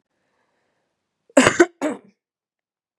cough_length: 3.0 s
cough_amplitude: 32768
cough_signal_mean_std_ratio: 0.24
survey_phase: beta (2021-08-13 to 2022-03-07)
age: 18-44
gender: Female
wearing_mask: 'No'
symptom_sore_throat: true
symptom_fatigue: true
symptom_headache: true
symptom_onset: 3 days
smoker_status: Never smoked
respiratory_condition_asthma: false
respiratory_condition_other: false
recruitment_source: Test and Trace
submission_delay: 1 day
covid_test_result: Positive
covid_test_method: RT-qPCR
covid_ct_value: 17.2
covid_ct_gene: ORF1ab gene
covid_ct_mean: 17.3
covid_viral_load: 2200000 copies/ml
covid_viral_load_category: High viral load (>1M copies/ml)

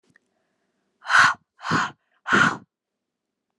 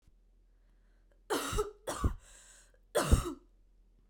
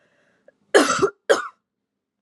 exhalation_length: 3.6 s
exhalation_amplitude: 22551
exhalation_signal_mean_std_ratio: 0.35
three_cough_length: 4.1 s
three_cough_amplitude: 8328
three_cough_signal_mean_std_ratio: 0.37
cough_length: 2.2 s
cough_amplitude: 27432
cough_signal_mean_std_ratio: 0.34
survey_phase: alpha (2021-03-01 to 2021-08-12)
age: 18-44
gender: Female
wearing_mask: 'No'
symptom_cough_any: true
symptom_new_continuous_cough: true
symptom_fatigue: true
symptom_headache: true
symptom_onset: 4 days
smoker_status: Never smoked
respiratory_condition_asthma: false
respiratory_condition_other: false
recruitment_source: Test and Trace
submission_delay: 1 day
covid_test_result: Positive
covid_test_method: RT-qPCR
covid_ct_value: 20.4
covid_ct_gene: ORF1ab gene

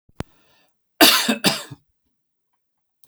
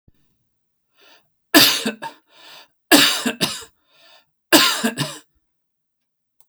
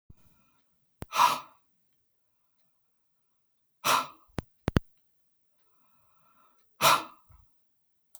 cough_length: 3.1 s
cough_amplitude: 32382
cough_signal_mean_std_ratio: 0.3
three_cough_length: 6.5 s
three_cough_amplitude: 32768
three_cough_signal_mean_std_ratio: 0.34
exhalation_length: 8.2 s
exhalation_amplitude: 16303
exhalation_signal_mean_std_ratio: 0.24
survey_phase: beta (2021-08-13 to 2022-03-07)
age: 45-64
gender: Male
wearing_mask: 'No'
symptom_none: true
symptom_onset: 13 days
smoker_status: Never smoked
respiratory_condition_asthma: false
respiratory_condition_other: false
recruitment_source: REACT
submission_delay: 1 day
covid_test_result: Negative
covid_test_method: RT-qPCR
influenza_a_test_result: Negative
influenza_b_test_result: Negative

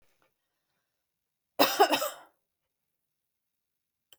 cough_length: 4.2 s
cough_amplitude: 16318
cough_signal_mean_std_ratio: 0.23
survey_phase: beta (2021-08-13 to 2022-03-07)
age: 45-64
gender: Female
wearing_mask: 'No'
symptom_none: true
smoker_status: Never smoked
respiratory_condition_asthma: false
respiratory_condition_other: false
recruitment_source: REACT
submission_delay: 2 days
covid_test_result: Negative
covid_test_method: RT-qPCR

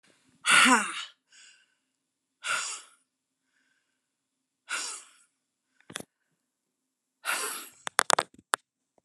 exhalation_length: 9.0 s
exhalation_amplitude: 31215
exhalation_signal_mean_std_ratio: 0.25
survey_phase: alpha (2021-03-01 to 2021-08-12)
age: 65+
gender: Female
wearing_mask: 'No'
symptom_none: true
smoker_status: Ex-smoker
respiratory_condition_asthma: false
respiratory_condition_other: false
recruitment_source: REACT
submission_delay: 3 days
covid_test_result: Negative
covid_test_method: RT-qPCR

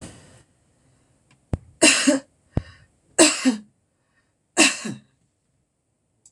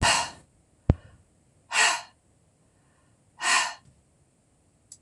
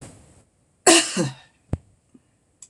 three_cough_length: 6.3 s
three_cough_amplitude: 26027
three_cough_signal_mean_std_ratio: 0.3
exhalation_length: 5.0 s
exhalation_amplitude: 21768
exhalation_signal_mean_std_ratio: 0.33
cough_length: 2.7 s
cough_amplitude: 26028
cough_signal_mean_std_ratio: 0.29
survey_phase: beta (2021-08-13 to 2022-03-07)
age: 65+
gender: Female
wearing_mask: 'No'
symptom_none: true
smoker_status: Never smoked
respiratory_condition_asthma: false
respiratory_condition_other: false
recruitment_source: REACT
submission_delay: 2 days
covid_test_result: Negative
covid_test_method: RT-qPCR
influenza_a_test_result: Negative
influenza_b_test_result: Negative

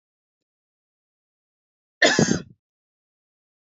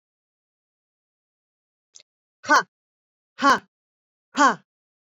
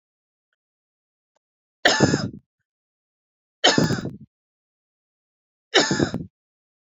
cough_length: 3.7 s
cough_amplitude: 23974
cough_signal_mean_std_ratio: 0.23
exhalation_length: 5.1 s
exhalation_amplitude: 19884
exhalation_signal_mean_std_ratio: 0.23
three_cough_length: 6.8 s
three_cough_amplitude: 27208
three_cough_signal_mean_std_ratio: 0.31
survey_phase: beta (2021-08-13 to 2022-03-07)
age: 45-64
gender: Female
wearing_mask: 'No'
symptom_runny_or_blocked_nose: true
symptom_sore_throat: true
symptom_fatigue: true
symptom_headache: true
smoker_status: Ex-smoker
respiratory_condition_asthma: false
respiratory_condition_other: false
recruitment_source: Test and Trace
submission_delay: 2 days
covid_test_result: Positive
covid_test_method: RT-qPCR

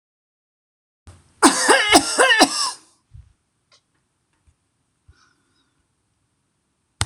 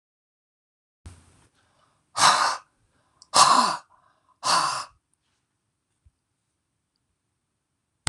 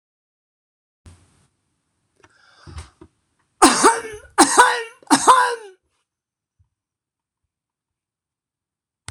cough_length: 7.1 s
cough_amplitude: 26028
cough_signal_mean_std_ratio: 0.31
exhalation_length: 8.1 s
exhalation_amplitude: 25283
exhalation_signal_mean_std_ratio: 0.29
three_cough_length: 9.1 s
three_cough_amplitude: 26028
three_cough_signal_mean_std_ratio: 0.28
survey_phase: beta (2021-08-13 to 2022-03-07)
age: 65+
gender: Male
wearing_mask: 'No'
symptom_none: true
smoker_status: Never smoked
respiratory_condition_asthma: false
respiratory_condition_other: true
recruitment_source: REACT
submission_delay: 2 days
covid_test_result: Negative
covid_test_method: RT-qPCR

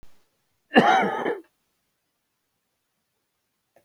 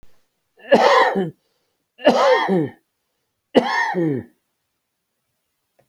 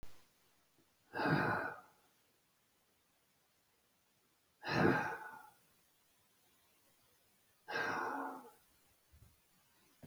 cough_length: 3.8 s
cough_amplitude: 27173
cough_signal_mean_std_ratio: 0.29
three_cough_length: 5.9 s
three_cough_amplitude: 32768
three_cough_signal_mean_std_ratio: 0.44
exhalation_length: 10.1 s
exhalation_amplitude: 3852
exhalation_signal_mean_std_ratio: 0.36
survey_phase: alpha (2021-03-01 to 2021-08-12)
age: 65+
gender: Male
wearing_mask: 'No'
symptom_fatigue: true
symptom_onset: 12 days
smoker_status: Current smoker (11 or more cigarettes per day)
respiratory_condition_asthma: false
respiratory_condition_other: false
recruitment_source: REACT
submission_delay: 2 days
covid_test_result: Negative
covid_test_method: RT-qPCR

